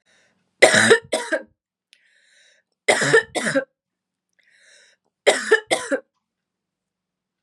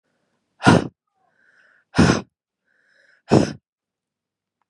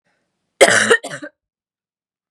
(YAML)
three_cough_length: 7.4 s
three_cough_amplitude: 32768
three_cough_signal_mean_std_ratio: 0.34
exhalation_length: 4.7 s
exhalation_amplitude: 32053
exhalation_signal_mean_std_ratio: 0.27
cough_length: 2.3 s
cough_amplitude: 32768
cough_signal_mean_std_ratio: 0.32
survey_phase: beta (2021-08-13 to 2022-03-07)
age: 18-44
gender: Female
wearing_mask: 'No'
symptom_cough_any: true
symptom_runny_or_blocked_nose: true
symptom_sore_throat: true
symptom_fatigue: true
symptom_other: true
symptom_onset: 4 days
smoker_status: Never smoked
respiratory_condition_asthma: false
respiratory_condition_other: false
recruitment_source: Test and Trace
submission_delay: 1 day
covid_test_result: Positive
covid_test_method: RT-qPCR
covid_ct_value: 20.0
covid_ct_gene: ORF1ab gene
covid_ct_mean: 20.3
covid_viral_load: 220000 copies/ml
covid_viral_load_category: Low viral load (10K-1M copies/ml)